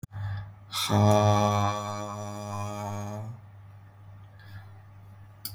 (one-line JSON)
{"exhalation_length": "5.5 s", "exhalation_amplitude": 9834, "exhalation_signal_mean_std_ratio": 0.58, "survey_phase": "beta (2021-08-13 to 2022-03-07)", "age": "18-44", "gender": "Male", "wearing_mask": "Yes", "symptom_none": true, "smoker_status": "Never smoked", "respiratory_condition_asthma": false, "respiratory_condition_other": false, "recruitment_source": "REACT", "submission_delay": "2 days", "covid_test_result": "Negative", "covid_test_method": "RT-qPCR", "influenza_a_test_result": "Negative", "influenza_b_test_result": "Negative"}